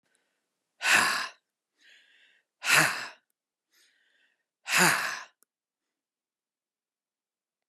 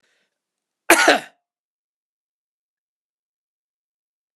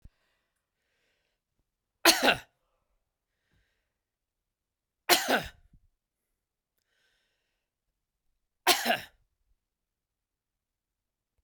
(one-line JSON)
{"exhalation_length": "7.7 s", "exhalation_amplitude": 13006, "exhalation_signal_mean_std_ratio": 0.31, "cough_length": "4.4 s", "cough_amplitude": 32768, "cough_signal_mean_std_ratio": 0.19, "three_cough_length": "11.4 s", "three_cough_amplitude": 20401, "three_cough_signal_mean_std_ratio": 0.2, "survey_phase": "beta (2021-08-13 to 2022-03-07)", "age": "45-64", "gender": "Male", "wearing_mask": "No", "symptom_loss_of_taste": true, "smoker_status": "Never smoked", "respiratory_condition_asthma": false, "respiratory_condition_other": false, "recruitment_source": "REACT", "submission_delay": "1 day", "covid_test_result": "Negative", "covid_test_method": "RT-qPCR"}